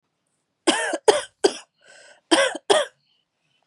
{"three_cough_length": "3.7 s", "three_cough_amplitude": 28773, "three_cough_signal_mean_std_ratio": 0.36, "survey_phase": "beta (2021-08-13 to 2022-03-07)", "age": "18-44", "gender": "Female", "wearing_mask": "No", "symptom_cough_any": true, "symptom_runny_or_blocked_nose": true, "symptom_sore_throat": true, "symptom_fever_high_temperature": true, "symptom_headache": true, "smoker_status": "Never smoked", "respiratory_condition_asthma": false, "respiratory_condition_other": false, "recruitment_source": "Test and Trace", "submission_delay": "29 days", "covid_test_result": "Negative", "covid_test_method": "RT-qPCR"}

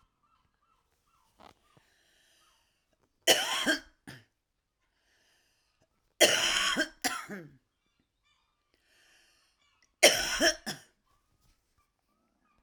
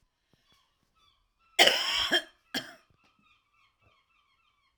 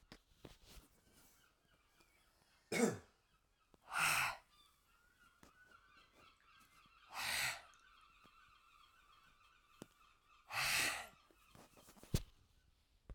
{"three_cough_length": "12.6 s", "three_cough_amplitude": 16909, "three_cough_signal_mean_std_ratio": 0.28, "cough_length": "4.8 s", "cough_amplitude": 21015, "cough_signal_mean_std_ratio": 0.27, "exhalation_length": "13.1 s", "exhalation_amplitude": 2815, "exhalation_signal_mean_std_ratio": 0.33, "survey_phase": "alpha (2021-03-01 to 2021-08-12)", "age": "45-64", "gender": "Female", "wearing_mask": "No", "symptom_headache": true, "smoker_status": "Current smoker (11 or more cigarettes per day)", "respiratory_condition_asthma": false, "respiratory_condition_other": false, "recruitment_source": "REACT", "submission_delay": "1 day", "covid_test_result": "Negative", "covid_test_method": "RT-qPCR"}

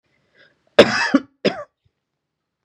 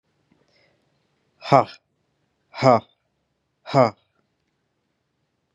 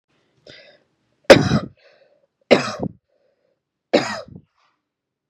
{"cough_length": "2.6 s", "cough_amplitude": 32768, "cough_signal_mean_std_ratio": 0.27, "exhalation_length": "5.5 s", "exhalation_amplitude": 29830, "exhalation_signal_mean_std_ratio": 0.21, "three_cough_length": "5.3 s", "three_cough_amplitude": 32768, "three_cough_signal_mean_std_ratio": 0.24, "survey_phase": "beta (2021-08-13 to 2022-03-07)", "age": "18-44", "gender": "Male", "wearing_mask": "No", "symptom_none": true, "smoker_status": "Never smoked", "respiratory_condition_asthma": false, "respiratory_condition_other": false, "recruitment_source": "REACT", "submission_delay": "3 days", "covid_test_result": "Negative", "covid_test_method": "RT-qPCR", "influenza_a_test_result": "Negative", "influenza_b_test_result": "Negative"}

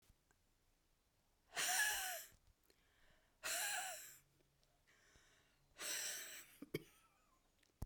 {"exhalation_length": "7.9 s", "exhalation_amplitude": 1471, "exhalation_signal_mean_std_ratio": 0.43, "survey_phase": "beta (2021-08-13 to 2022-03-07)", "age": "65+", "gender": "Female", "wearing_mask": "No", "symptom_new_continuous_cough": true, "symptom_runny_or_blocked_nose": true, "symptom_fatigue": true, "symptom_change_to_sense_of_smell_or_taste": true, "symptom_loss_of_taste": true, "symptom_onset": "3 days", "smoker_status": "Ex-smoker", "respiratory_condition_asthma": false, "respiratory_condition_other": false, "recruitment_source": "Test and Trace", "submission_delay": "2 days", "covid_test_result": "Positive", "covid_test_method": "RT-qPCR", "covid_ct_value": 16.4, "covid_ct_gene": "ORF1ab gene", "covid_ct_mean": 16.9, "covid_viral_load": "2900000 copies/ml", "covid_viral_load_category": "High viral load (>1M copies/ml)"}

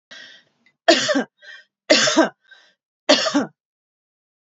{"three_cough_length": "4.5 s", "three_cough_amplitude": 30818, "three_cough_signal_mean_std_ratio": 0.37, "survey_phase": "beta (2021-08-13 to 2022-03-07)", "age": "18-44", "gender": "Female", "wearing_mask": "No", "symptom_prefer_not_to_say": true, "smoker_status": "Current smoker (1 to 10 cigarettes per day)", "respiratory_condition_asthma": false, "respiratory_condition_other": false, "recruitment_source": "REACT", "submission_delay": "1 day", "covid_test_result": "Negative", "covid_test_method": "RT-qPCR", "influenza_a_test_result": "Negative", "influenza_b_test_result": "Negative"}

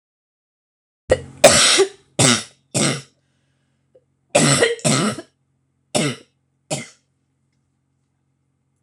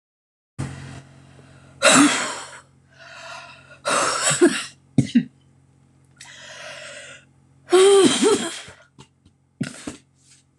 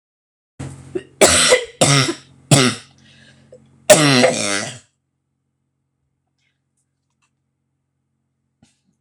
{"cough_length": "8.8 s", "cough_amplitude": 26028, "cough_signal_mean_std_ratio": 0.37, "exhalation_length": "10.6 s", "exhalation_amplitude": 26026, "exhalation_signal_mean_std_ratio": 0.41, "three_cough_length": "9.0 s", "three_cough_amplitude": 26028, "three_cough_signal_mean_std_ratio": 0.34, "survey_phase": "beta (2021-08-13 to 2022-03-07)", "age": "45-64", "gender": "Female", "wearing_mask": "No", "symptom_cough_any": true, "symptom_new_continuous_cough": true, "symptom_runny_or_blocked_nose": true, "symptom_shortness_of_breath": true, "symptom_sore_throat": true, "symptom_abdominal_pain": true, "symptom_diarrhoea": true, "symptom_fatigue": true, "symptom_headache": true, "symptom_onset": "10 days", "smoker_status": "Ex-smoker", "respiratory_condition_asthma": false, "respiratory_condition_other": false, "recruitment_source": "REACT", "submission_delay": "1 day", "covid_test_result": "Negative", "covid_test_method": "RT-qPCR", "influenza_a_test_result": "Unknown/Void", "influenza_b_test_result": "Unknown/Void"}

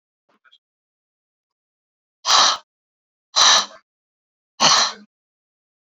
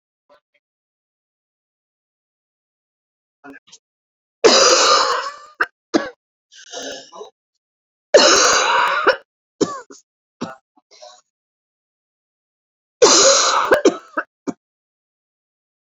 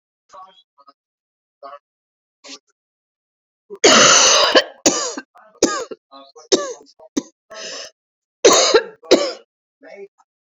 {"exhalation_length": "5.8 s", "exhalation_amplitude": 31325, "exhalation_signal_mean_std_ratio": 0.31, "three_cough_length": "16.0 s", "three_cough_amplitude": 32768, "three_cough_signal_mean_std_ratio": 0.35, "cough_length": "10.6 s", "cough_amplitude": 32767, "cough_signal_mean_std_ratio": 0.35, "survey_phase": "beta (2021-08-13 to 2022-03-07)", "age": "18-44", "gender": "Female", "wearing_mask": "No", "symptom_other": true, "symptom_onset": "3 days", "smoker_status": "Never smoked", "respiratory_condition_asthma": false, "respiratory_condition_other": false, "recruitment_source": "Test and Trace", "submission_delay": "1 day", "covid_test_result": "Positive", "covid_test_method": "RT-qPCR", "covid_ct_value": 18.8, "covid_ct_gene": "ORF1ab gene", "covid_ct_mean": 19.2, "covid_viral_load": "500000 copies/ml", "covid_viral_load_category": "Low viral load (10K-1M copies/ml)"}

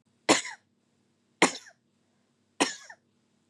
{"three_cough_length": "3.5 s", "three_cough_amplitude": 17955, "three_cough_signal_mean_std_ratio": 0.23, "survey_phase": "beta (2021-08-13 to 2022-03-07)", "age": "18-44", "gender": "Female", "wearing_mask": "No", "symptom_runny_or_blocked_nose": true, "symptom_onset": "4 days", "smoker_status": "Ex-smoker", "respiratory_condition_asthma": false, "respiratory_condition_other": false, "recruitment_source": "Test and Trace", "submission_delay": "2 days", "covid_test_result": "Positive", "covid_test_method": "RT-qPCR", "covid_ct_value": 20.3, "covid_ct_gene": "N gene"}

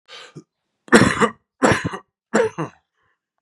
{"three_cough_length": "3.4 s", "three_cough_amplitude": 32768, "three_cough_signal_mean_std_ratio": 0.37, "survey_phase": "beta (2021-08-13 to 2022-03-07)", "age": "45-64", "gender": "Male", "wearing_mask": "No", "symptom_cough_any": true, "symptom_new_continuous_cough": true, "symptom_fatigue": true, "symptom_fever_high_temperature": true, "symptom_headache": true, "symptom_onset": "3 days", "smoker_status": "Never smoked", "respiratory_condition_asthma": false, "respiratory_condition_other": false, "recruitment_source": "Test and Trace", "submission_delay": "2 days", "covid_test_result": "Positive", "covid_test_method": "RT-qPCR", "covid_ct_value": 10.7, "covid_ct_gene": "ORF1ab gene"}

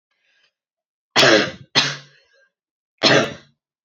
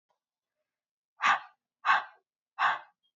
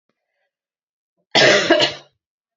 {"three_cough_length": "3.8 s", "three_cough_amplitude": 29599, "three_cough_signal_mean_std_ratio": 0.36, "exhalation_length": "3.2 s", "exhalation_amplitude": 9781, "exhalation_signal_mean_std_ratio": 0.32, "cough_length": "2.6 s", "cough_amplitude": 28810, "cough_signal_mean_std_ratio": 0.38, "survey_phase": "beta (2021-08-13 to 2022-03-07)", "age": "18-44", "gender": "Female", "wearing_mask": "No", "symptom_cough_any": true, "symptom_new_continuous_cough": true, "symptom_runny_or_blocked_nose": true, "symptom_sore_throat": true, "smoker_status": "Never smoked", "respiratory_condition_asthma": false, "respiratory_condition_other": false, "recruitment_source": "Test and Trace", "submission_delay": "1 day", "covid_test_result": "Positive", "covid_test_method": "ePCR"}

